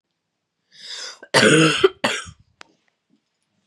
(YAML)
cough_length: 3.7 s
cough_amplitude: 31339
cough_signal_mean_std_ratio: 0.35
survey_phase: beta (2021-08-13 to 2022-03-07)
age: 18-44
gender: Female
wearing_mask: 'No'
symptom_cough_any: true
symptom_abdominal_pain: true
symptom_fatigue: true
symptom_headache: true
smoker_status: Never smoked
respiratory_condition_asthma: false
respiratory_condition_other: false
recruitment_source: Test and Trace
submission_delay: 2 days
covid_test_result: Positive
covid_test_method: RT-qPCR
covid_ct_value: 23.6
covid_ct_gene: ORF1ab gene
covid_ct_mean: 25.7
covid_viral_load: 3700 copies/ml
covid_viral_load_category: Minimal viral load (< 10K copies/ml)